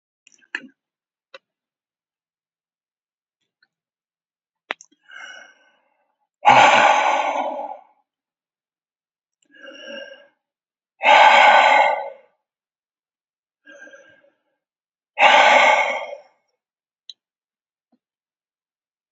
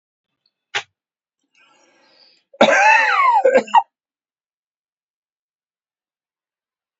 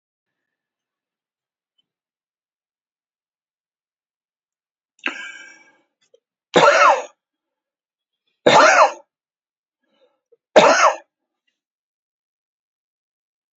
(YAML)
exhalation_length: 19.1 s
exhalation_amplitude: 30905
exhalation_signal_mean_std_ratio: 0.32
cough_length: 7.0 s
cough_amplitude: 27886
cough_signal_mean_std_ratio: 0.33
three_cough_length: 13.6 s
three_cough_amplitude: 28671
three_cough_signal_mean_std_ratio: 0.25
survey_phase: beta (2021-08-13 to 2022-03-07)
age: 65+
gender: Male
wearing_mask: 'No'
symptom_none: true
smoker_status: Ex-smoker
respiratory_condition_asthma: false
respiratory_condition_other: false
recruitment_source: REACT
submission_delay: 1 day
covid_test_result: Negative
covid_test_method: RT-qPCR